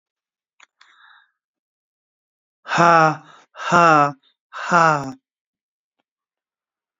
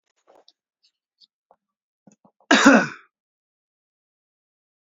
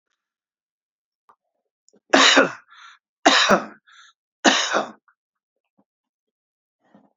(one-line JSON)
{"exhalation_length": "7.0 s", "exhalation_amplitude": 29255, "exhalation_signal_mean_std_ratio": 0.31, "cough_length": "4.9 s", "cough_amplitude": 28728, "cough_signal_mean_std_ratio": 0.2, "three_cough_length": "7.2 s", "three_cough_amplitude": 32767, "three_cough_signal_mean_std_ratio": 0.3, "survey_phase": "beta (2021-08-13 to 2022-03-07)", "age": "45-64", "gender": "Male", "wearing_mask": "No", "symptom_none": true, "smoker_status": "Never smoked", "respiratory_condition_asthma": false, "respiratory_condition_other": false, "recruitment_source": "REACT", "submission_delay": "1 day", "covid_test_method": "RT-qPCR"}